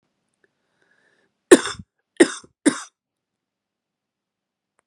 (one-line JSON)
{"three_cough_length": "4.9 s", "three_cough_amplitude": 32768, "three_cough_signal_mean_std_ratio": 0.16, "survey_phase": "beta (2021-08-13 to 2022-03-07)", "age": "45-64", "gender": "Female", "wearing_mask": "No", "symptom_cough_any": true, "symptom_runny_or_blocked_nose": true, "symptom_sore_throat": true, "symptom_fatigue": true, "symptom_headache": true, "symptom_change_to_sense_of_smell_or_taste": true, "symptom_onset": "2 days", "smoker_status": "Never smoked", "respiratory_condition_asthma": true, "respiratory_condition_other": false, "recruitment_source": "Test and Trace", "submission_delay": "1 day", "covid_test_result": "Positive", "covid_test_method": "RT-qPCR", "covid_ct_value": 21.8, "covid_ct_gene": "N gene", "covid_ct_mean": 22.3, "covid_viral_load": "50000 copies/ml", "covid_viral_load_category": "Low viral load (10K-1M copies/ml)"}